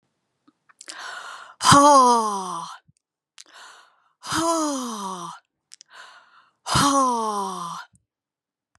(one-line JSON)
{"exhalation_length": "8.8 s", "exhalation_amplitude": 30705, "exhalation_signal_mean_std_ratio": 0.43, "survey_phase": "beta (2021-08-13 to 2022-03-07)", "age": "45-64", "gender": "Female", "wearing_mask": "No", "symptom_headache": true, "smoker_status": "Never smoked", "respiratory_condition_asthma": false, "respiratory_condition_other": false, "recruitment_source": "Test and Trace", "submission_delay": "2 days", "covid_test_result": "Positive", "covid_test_method": "RT-qPCR", "covid_ct_value": 32.6, "covid_ct_gene": "ORF1ab gene"}